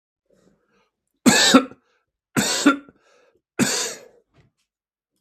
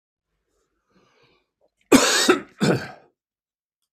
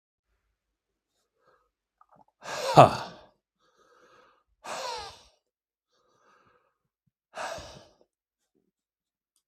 three_cough_length: 5.2 s
three_cough_amplitude: 32766
three_cough_signal_mean_std_ratio: 0.34
cough_length: 3.9 s
cough_amplitude: 32766
cough_signal_mean_std_ratio: 0.31
exhalation_length: 9.5 s
exhalation_amplitude: 32766
exhalation_signal_mean_std_ratio: 0.16
survey_phase: beta (2021-08-13 to 2022-03-07)
age: 65+
gender: Male
wearing_mask: 'No'
symptom_none: true
smoker_status: Ex-smoker
respiratory_condition_asthma: false
respiratory_condition_other: false
recruitment_source: REACT
submission_delay: 3 days
covid_test_result: Negative
covid_test_method: RT-qPCR
influenza_a_test_result: Negative
influenza_b_test_result: Negative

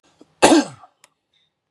cough_length: 1.7 s
cough_amplitude: 32767
cough_signal_mean_std_ratio: 0.29
survey_phase: beta (2021-08-13 to 2022-03-07)
age: 45-64
gender: Male
wearing_mask: 'No'
symptom_none: true
smoker_status: Ex-smoker
respiratory_condition_asthma: false
respiratory_condition_other: false
recruitment_source: REACT
submission_delay: 2 days
covid_test_result: Negative
covid_test_method: RT-qPCR
influenza_a_test_result: Negative
influenza_b_test_result: Negative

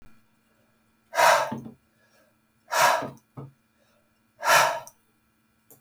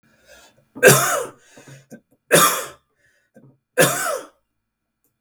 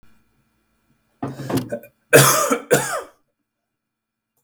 exhalation_length: 5.8 s
exhalation_amplitude: 21118
exhalation_signal_mean_std_ratio: 0.35
three_cough_length: 5.2 s
three_cough_amplitude: 32768
three_cough_signal_mean_std_ratio: 0.35
cough_length: 4.4 s
cough_amplitude: 32768
cough_signal_mean_std_ratio: 0.35
survey_phase: beta (2021-08-13 to 2022-03-07)
age: 45-64
gender: Male
wearing_mask: 'No'
symptom_none: true
smoker_status: Ex-smoker
respiratory_condition_asthma: false
respiratory_condition_other: false
recruitment_source: REACT
submission_delay: 2 days
covid_test_result: Negative
covid_test_method: RT-qPCR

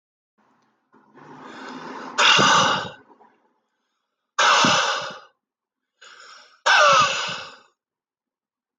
exhalation_length: 8.8 s
exhalation_amplitude: 25674
exhalation_signal_mean_std_ratio: 0.42
survey_phase: alpha (2021-03-01 to 2021-08-12)
age: 18-44
gender: Male
wearing_mask: 'No'
symptom_fatigue: true
symptom_onset: 4 days
smoker_status: Never smoked
respiratory_condition_asthma: true
respiratory_condition_other: false
recruitment_source: Test and Trace
submission_delay: 2 days
covid_test_result: Positive
covid_test_method: RT-qPCR
covid_ct_value: 12.2
covid_ct_gene: ORF1ab gene
covid_ct_mean: 13.0
covid_viral_load: 54000000 copies/ml
covid_viral_load_category: High viral load (>1M copies/ml)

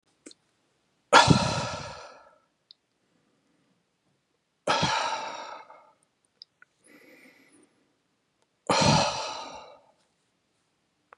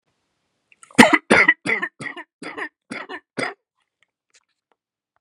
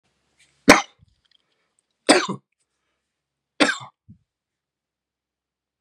exhalation_length: 11.2 s
exhalation_amplitude: 31500
exhalation_signal_mean_std_ratio: 0.3
cough_length: 5.2 s
cough_amplitude: 32768
cough_signal_mean_std_ratio: 0.28
three_cough_length: 5.8 s
three_cough_amplitude: 32768
three_cough_signal_mean_std_ratio: 0.19
survey_phase: beta (2021-08-13 to 2022-03-07)
age: 45-64
gender: Male
wearing_mask: 'No'
symptom_none: true
smoker_status: Never smoked
respiratory_condition_asthma: false
respiratory_condition_other: false
recruitment_source: REACT
submission_delay: 2 days
covid_test_result: Negative
covid_test_method: RT-qPCR
influenza_a_test_result: Negative
influenza_b_test_result: Negative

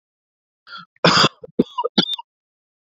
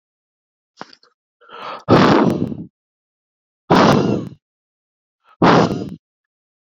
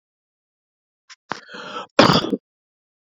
three_cough_length: 2.9 s
three_cough_amplitude: 27612
three_cough_signal_mean_std_ratio: 0.33
exhalation_length: 6.7 s
exhalation_amplitude: 29858
exhalation_signal_mean_std_ratio: 0.39
cough_length: 3.1 s
cough_amplitude: 28820
cough_signal_mean_std_ratio: 0.27
survey_phase: beta (2021-08-13 to 2022-03-07)
age: 18-44
gender: Male
wearing_mask: 'No'
symptom_none: true
smoker_status: Current smoker (1 to 10 cigarettes per day)
respiratory_condition_asthma: false
respiratory_condition_other: false
recruitment_source: REACT
submission_delay: 0 days
covid_test_result: Negative
covid_test_method: RT-qPCR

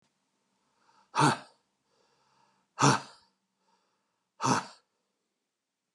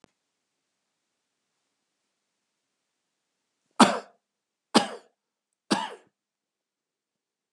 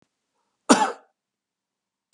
exhalation_length: 5.9 s
exhalation_amplitude: 12365
exhalation_signal_mean_std_ratio: 0.25
three_cough_length: 7.5 s
three_cough_amplitude: 26247
three_cough_signal_mean_std_ratio: 0.16
cough_length: 2.1 s
cough_amplitude: 32767
cough_signal_mean_std_ratio: 0.22
survey_phase: beta (2021-08-13 to 2022-03-07)
age: 65+
gender: Male
wearing_mask: 'No'
symptom_none: true
smoker_status: Never smoked
respiratory_condition_asthma: false
respiratory_condition_other: false
recruitment_source: REACT
submission_delay: 2 days
covid_test_result: Negative
covid_test_method: RT-qPCR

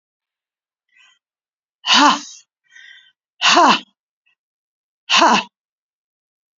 exhalation_length: 6.6 s
exhalation_amplitude: 30415
exhalation_signal_mean_std_ratio: 0.32
survey_phase: beta (2021-08-13 to 2022-03-07)
age: 65+
gender: Female
wearing_mask: 'No'
symptom_cough_any: true
symptom_new_continuous_cough: true
symptom_sore_throat: true
smoker_status: Never smoked
respiratory_condition_asthma: false
respiratory_condition_other: false
recruitment_source: REACT
submission_delay: 2 days
covid_test_result: Positive
covid_test_method: RT-qPCR
covid_ct_value: 33.0
covid_ct_gene: E gene
influenza_a_test_result: Negative
influenza_b_test_result: Negative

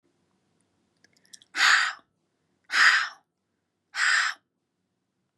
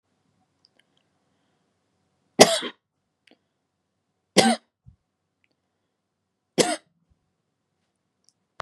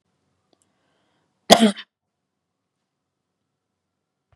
exhalation_length: 5.4 s
exhalation_amplitude: 16248
exhalation_signal_mean_std_ratio: 0.35
three_cough_length: 8.6 s
three_cough_amplitude: 32768
three_cough_signal_mean_std_ratio: 0.17
cough_length: 4.4 s
cough_amplitude: 32768
cough_signal_mean_std_ratio: 0.16
survey_phase: beta (2021-08-13 to 2022-03-07)
age: 18-44
gender: Female
wearing_mask: 'No'
symptom_none: true
smoker_status: Never smoked
respiratory_condition_asthma: false
respiratory_condition_other: false
recruitment_source: REACT
submission_delay: 1 day
covid_test_result: Negative
covid_test_method: RT-qPCR
influenza_a_test_result: Negative
influenza_b_test_result: Negative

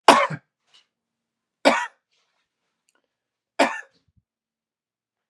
three_cough_length: 5.3 s
three_cough_amplitude: 32768
three_cough_signal_mean_std_ratio: 0.22
survey_phase: beta (2021-08-13 to 2022-03-07)
age: 45-64
gender: Male
wearing_mask: 'No'
symptom_sore_throat: true
smoker_status: Never smoked
respiratory_condition_asthma: true
respiratory_condition_other: false
recruitment_source: Test and Trace
submission_delay: 2 days
covid_test_result: Positive
covid_test_method: LFT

